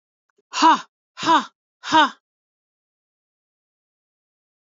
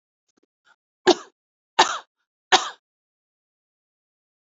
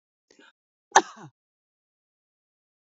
{
  "exhalation_length": "4.8 s",
  "exhalation_amplitude": 24452,
  "exhalation_signal_mean_std_ratio": 0.28,
  "three_cough_length": "4.5 s",
  "three_cough_amplitude": 27647,
  "three_cough_signal_mean_std_ratio": 0.19,
  "cough_length": "2.8 s",
  "cough_amplitude": 29074,
  "cough_signal_mean_std_ratio": 0.12,
  "survey_phase": "beta (2021-08-13 to 2022-03-07)",
  "age": "45-64",
  "gender": "Female",
  "wearing_mask": "No",
  "symptom_none": true,
  "smoker_status": "Never smoked",
  "respiratory_condition_asthma": false,
  "respiratory_condition_other": false,
  "recruitment_source": "REACT",
  "submission_delay": "1 day",
  "covid_test_result": "Negative",
  "covid_test_method": "RT-qPCR",
  "influenza_a_test_result": "Negative",
  "influenza_b_test_result": "Negative"
}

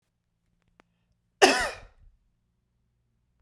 {
  "cough_length": "3.4 s",
  "cough_amplitude": 29869,
  "cough_signal_mean_std_ratio": 0.2,
  "survey_phase": "beta (2021-08-13 to 2022-03-07)",
  "age": "18-44",
  "gender": "Male",
  "wearing_mask": "No",
  "symptom_none": true,
  "smoker_status": "Never smoked",
  "respiratory_condition_asthma": false,
  "respiratory_condition_other": false,
  "recruitment_source": "Test and Trace",
  "submission_delay": "0 days",
  "covid_test_result": "Negative",
  "covid_test_method": "LFT"
}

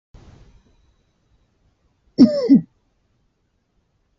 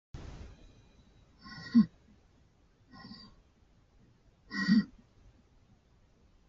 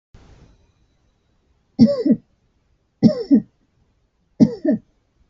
{
  "cough_length": "4.2 s",
  "cough_amplitude": 28332,
  "cough_signal_mean_std_ratio": 0.23,
  "exhalation_length": "6.5 s",
  "exhalation_amplitude": 6094,
  "exhalation_signal_mean_std_ratio": 0.25,
  "three_cough_length": "5.3 s",
  "three_cough_amplitude": 29834,
  "three_cough_signal_mean_std_ratio": 0.31,
  "survey_phase": "alpha (2021-03-01 to 2021-08-12)",
  "age": "45-64",
  "gender": "Female",
  "wearing_mask": "No",
  "symptom_none": true,
  "smoker_status": "Never smoked",
  "respiratory_condition_asthma": false,
  "respiratory_condition_other": false,
  "recruitment_source": "REACT",
  "submission_delay": "1 day",
  "covid_test_result": "Negative",
  "covid_test_method": "RT-qPCR"
}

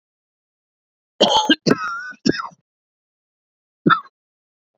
{
  "cough_length": "4.8 s",
  "cough_amplitude": 29840,
  "cough_signal_mean_std_ratio": 0.32,
  "survey_phase": "beta (2021-08-13 to 2022-03-07)",
  "age": "45-64",
  "gender": "Female",
  "wearing_mask": "No",
  "symptom_cough_any": true,
  "symptom_runny_or_blocked_nose": true,
  "symptom_abdominal_pain": true,
  "symptom_diarrhoea": true,
  "symptom_fatigue": true,
  "symptom_change_to_sense_of_smell_or_taste": true,
  "symptom_loss_of_taste": true,
  "symptom_other": true,
  "symptom_onset": "5 days",
  "smoker_status": "Never smoked",
  "respiratory_condition_asthma": true,
  "respiratory_condition_other": false,
  "recruitment_source": "Test and Trace",
  "submission_delay": "2 days",
  "covid_test_result": "Positive",
  "covid_test_method": "RT-qPCR"
}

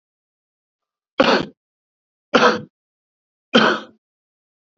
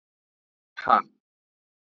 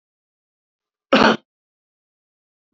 {
  "three_cough_length": "4.8 s",
  "three_cough_amplitude": 28714,
  "three_cough_signal_mean_std_ratio": 0.3,
  "exhalation_length": "2.0 s",
  "exhalation_amplitude": 18760,
  "exhalation_signal_mean_std_ratio": 0.2,
  "cough_length": "2.7 s",
  "cough_amplitude": 28430,
  "cough_signal_mean_std_ratio": 0.22,
  "survey_phase": "beta (2021-08-13 to 2022-03-07)",
  "age": "45-64",
  "gender": "Male",
  "wearing_mask": "No",
  "symptom_fatigue": true,
  "symptom_headache": true,
  "symptom_onset": "2 days",
  "smoker_status": "Never smoked",
  "respiratory_condition_asthma": false,
  "respiratory_condition_other": false,
  "recruitment_source": "Test and Trace",
  "submission_delay": "2 days",
  "covid_test_result": "Positive",
  "covid_test_method": "RT-qPCR",
  "covid_ct_value": 14.8,
  "covid_ct_gene": "ORF1ab gene",
  "covid_ct_mean": 15.0,
  "covid_viral_load": "12000000 copies/ml",
  "covid_viral_load_category": "High viral load (>1M copies/ml)"
}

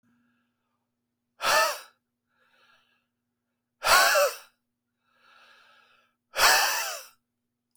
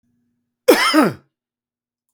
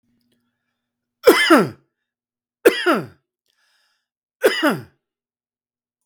{
  "exhalation_length": "7.8 s",
  "exhalation_amplitude": 14918,
  "exhalation_signal_mean_std_ratio": 0.34,
  "cough_length": "2.1 s",
  "cough_amplitude": 32768,
  "cough_signal_mean_std_ratio": 0.35,
  "three_cough_length": "6.1 s",
  "three_cough_amplitude": 32768,
  "three_cough_signal_mean_std_ratio": 0.3,
  "survey_phase": "beta (2021-08-13 to 2022-03-07)",
  "age": "45-64",
  "gender": "Male",
  "wearing_mask": "No",
  "symptom_none": true,
  "smoker_status": "Ex-smoker",
  "respiratory_condition_asthma": false,
  "respiratory_condition_other": false,
  "recruitment_source": "REACT",
  "submission_delay": "1 day",
  "covid_test_result": "Negative",
  "covid_test_method": "RT-qPCR",
  "influenza_a_test_result": "Negative",
  "influenza_b_test_result": "Negative"
}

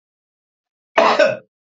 {
  "cough_length": "1.8 s",
  "cough_amplitude": 28852,
  "cough_signal_mean_std_ratio": 0.37,
  "survey_phase": "beta (2021-08-13 to 2022-03-07)",
  "age": "45-64",
  "gender": "Male",
  "wearing_mask": "No",
  "symptom_none": true,
  "smoker_status": "Ex-smoker",
  "respiratory_condition_asthma": false,
  "respiratory_condition_other": false,
  "recruitment_source": "REACT",
  "submission_delay": "10 days",
  "covid_test_result": "Negative",
  "covid_test_method": "RT-qPCR"
}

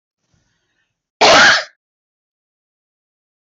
{
  "cough_length": "3.4 s",
  "cough_amplitude": 26166,
  "cough_signal_mean_std_ratio": 0.31,
  "survey_phase": "beta (2021-08-13 to 2022-03-07)",
  "age": "65+",
  "gender": "Female",
  "wearing_mask": "No",
  "symptom_none": true,
  "smoker_status": "Ex-smoker",
  "respiratory_condition_asthma": false,
  "respiratory_condition_other": false,
  "recruitment_source": "REACT",
  "submission_delay": "2 days",
  "covid_test_result": "Negative",
  "covid_test_method": "RT-qPCR",
  "influenza_a_test_result": "Negative",
  "influenza_b_test_result": "Negative"
}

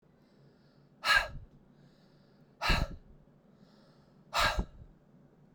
{
  "exhalation_length": "5.5 s",
  "exhalation_amplitude": 7033,
  "exhalation_signal_mean_std_ratio": 0.34,
  "survey_phase": "alpha (2021-03-01 to 2021-08-12)",
  "age": "18-44",
  "gender": "Male",
  "wearing_mask": "No",
  "symptom_cough_any": true,
  "symptom_diarrhoea": true,
  "symptom_fatigue": true,
  "symptom_fever_high_temperature": true,
  "symptom_headache": true,
  "symptom_change_to_sense_of_smell_or_taste": true,
  "symptom_loss_of_taste": true,
  "symptom_onset": "3 days",
  "smoker_status": "Never smoked",
  "respiratory_condition_asthma": false,
  "respiratory_condition_other": false,
  "recruitment_source": "Test and Trace",
  "submission_delay": "3 days",
  "covid_test_result": "Positive",
  "covid_test_method": "RT-qPCR",
  "covid_ct_value": 18.0,
  "covid_ct_gene": "ORF1ab gene",
  "covid_ct_mean": 19.2,
  "covid_viral_load": "490000 copies/ml",
  "covid_viral_load_category": "Low viral load (10K-1M copies/ml)"
}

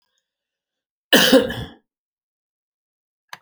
{
  "cough_length": "3.4 s",
  "cough_amplitude": 30522,
  "cough_signal_mean_std_ratio": 0.26,
  "survey_phase": "alpha (2021-03-01 to 2021-08-12)",
  "age": "65+",
  "gender": "Male",
  "wearing_mask": "No",
  "symptom_none": true,
  "smoker_status": "Never smoked",
  "respiratory_condition_asthma": true,
  "respiratory_condition_other": false,
  "recruitment_source": "Test and Trace",
  "submission_delay": "0 days",
  "covid_test_result": "Negative",
  "covid_test_method": "LFT"
}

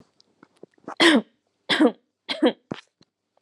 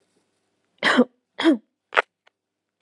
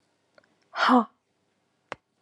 {
  "three_cough_length": "3.4 s",
  "three_cough_amplitude": 21839,
  "three_cough_signal_mean_std_ratio": 0.33,
  "cough_length": "2.8 s",
  "cough_amplitude": 30070,
  "cough_signal_mean_std_ratio": 0.3,
  "exhalation_length": "2.2 s",
  "exhalation_amplitude": 15566,
  "exhalation_signal_mean_std_ratio": 0.27,
  "survey_phase": "beta (2021-08-13 to 2022-03-07)",
  "age": "18-44",
  "gender": "Female",
  "wearing_mask": "Yes",
  "symptom_none": true,
  "smoker_status": "Never smoked",
  "respiratory_condition_asthma": false,
  "respiratory_condition_other": false,
  "recruitment_source": "REACT",
  "submission_delay": "2 days",
  "covid_test_result": "Negative",
  "covid_test_method": "RT-qPCR",
  "influenza_a_test_result": "Negative",
  "influenza_b_test_result": "Negative"
}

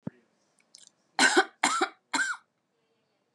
{
  "three_cough_length": "3.3 s",
  "three_cough_amplitude": 13175,
  "three_cough_signal_mean_std_ratio": 0.35,
  "survey_phase": "beta (2021-08-13 to 2022-03-07)",
  "age": "18-44",
  "gender": "Female",
  "wearing_mask": "No",
  "symptom_none": true,
  "smoker_status": "Never smoked",
  "respiratory_condition_asthma": false,
  "respiratory_condition_other": false,
  "recruitment_source": "REACT",
  "submission_delay": "1 day",
  "covid_test_result": "Negative",
  "covid_test_method": "RT-qPCR",
  "influenza_a_test_result": "Negative",
  "influenza_b_test_result": "Negative"
}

